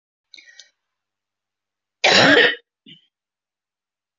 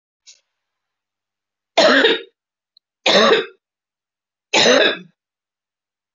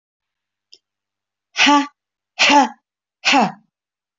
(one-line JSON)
{"cough_length": "4.2 s", "cough_amplitude": 29382, "cough_signal_mean_std_ratio": 0.28, "three_cough_length": "6.1 s", "three_cough_amplitude": 27349, "three_cough_signal_mean_std_ratio": 0.37, "exhalation_length": "4.2 s", "exhalation_amplitude": 26598, "exhalation_signal_mean_std_ratio": 0.36, "survey_phase": "alpha (2021-03-01 to 2021-08-12)", "age": "45-64", "gender": "Female", "wearing_mask": "No", "symptom_none": true, "symptom_onset": "12 days", "smoker_status": "Never smoked", "respiratory_condition_asthma": false, "respiratory_condition_other": false, "recruitment_source": "REACT", "submission_delay": "2 days", "covid_test_result": "Negative", "covid_test_method": "RT-qPCR"}